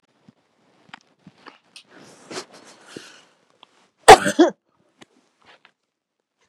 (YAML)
cough_length: 6.5 s
cough_amplitude: 32768
cough_signal_mean_std_ratio: 0.16
survey_phase: beta (2021-08-13 to 2022-03-07)
age: 65+
gender: Female
wearing_mask: 'No'
symptom_none: true
smoker_status: Ex-smoker
respiratory_condition_asthma: false
respiratory_condition_other: false
recruitment_source: REACT
submission_delay: 2 days
covid_test_result: Negative
covid_test_method: RT-qPCR
influenza_a_test_result: Negative
influenza_b_test_result: Negative